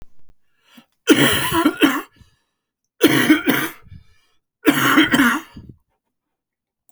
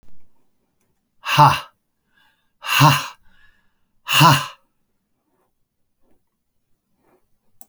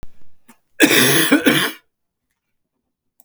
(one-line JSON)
{"three_cough_length": "6.9 s", "three_cough_amplitude": 32768, "three_cough_signal_mean_std_ratio": 0.46, "exhalation_length": "7.7 s", "exhalation_amplitude": 32768, "exhalation_signal_mean_std_ratio": 0.29, "cough_length": "3.2 s", "cough_amplitude": 32768, "cough_signal_mean_std_ratio": 0.46, "survey_phase": "beta (2021-08-13 to 2022-03-07)", "age": "65+", "gender": "Male", "wearing_mask": "No", "symptom_cough_any": true, "symptom_runny_or_blocked_nose": true, "symptom_shortness_of_breath": true, "symptom_abdominal_pain": true, "symptom_fatigue": true, "symptom_headache": true, "symptom_change_to_sense_of_smell_or_taste": true, "symptom_onset": "2 days", "smoker_status": "Never smoked", "respiratory_condition_asthma": false, "respiratory_condition_other": false, "recruitment_source": "Test and Trace", "submission_delay": "2 days", "covid_test_result": "Positive", "covid_test_method": "RT-qPCR", "covid_ct_value": 18.2, "covid_ct_gene": "ORF1ab gene", "covid_ct_mean": 18.6, "covid_viral_load": "790000 copies/ml", "covid_viral_load_category": "Low viral load (10K-1M copies/ml)"}